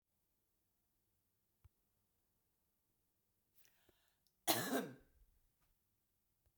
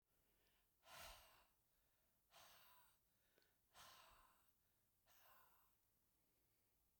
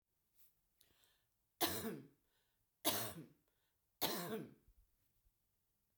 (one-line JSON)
{"cough_length": "6.6 s", "cough_amplitude": 4211, "cough_signal_mean_std_ratio": 0.2, "exhalation_length": "7.0 s", "exhalation_amplitude": 147, "exhalation_signal_mean_std_ratio": 0.58, "three_cough_length": "6.0 s", "three_cough_amplitude": 2586, "three_cough_signal_mean_std_ratio": 0.34, "survey_phase": "beta (2021-08-13 to 2022-03-07)", "age": "45-64", "gender": "Female", "wearing_mask": "No", "symptom_none": true, "smoker_status": "Current smoker (11 or more cigarettes per day)", "respiratory_condition_asthma": false, "respiratory_condition_other": false, "recruitment_source": "REACT", "submission_delay": "2 days", "covid_test_result": "Negative", "covid_test_method": "RT-qPCR", "influenza_a_test_result": "Negative", "influenza_b_test_result": "Negative"}